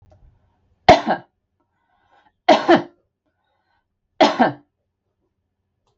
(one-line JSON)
{"three_cough_length": "6.0 s", "three_cough_amplitude": 32768, "three_cough_signal_mean_std_ratio": 0.26, "survey_phase": "beta (2021-08-13 to 2022-03-07)", "age": "45-64", "gender": "Female", "wearing_mask": "No", "symptom_none": true, "smoker_status": "Never smoked", "respiratory_condition_asthma": false, "respiratory_condition_other": false, "recruitment_source": "REACT", "submission_delay": "2 days", "covid_test_result": "Negative", "covid_test_method": "RT-qPCR", "influenza_a_test_result": "Negative", "influenza_b_test_result": "Negative"}